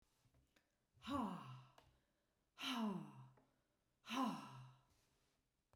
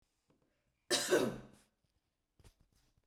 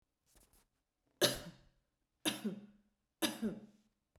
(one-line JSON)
{"exhalation_length": "5.8 s", "exhalation_amplitude": 905, "exhalation_signal_mean_std_ratio": 0.44, "cough_length": "3.1 s", "cough_amplitude": 3835, "cough_signal_mean_std_ratio": 0.3, "three_cough_length": "4.2 s", "three_cough_amplitude": 6161, "three_cough_signal_mean_std_ratio": 0.32, "survey_phase": "beta (2021-08-13 to 2022-03-07)", "age": "45-64", "gender": "Female", "wearing_mask": "No", "symptom_sore_throat": true, "symptom_fatigue": true, "symptom_onset": "13 days", "smoker_status": "Never smoked", "respiratory_condition_asthma": false, "respiratory_condition_other": false, "recruitment_source": "REACT", "submission_delay": "2 days", "covid_test_result": "Negative", "covid_test_method": "RT-qPCR", "influenza_a_test_result": "Negative", "influenza_b_test_result": "Negative"}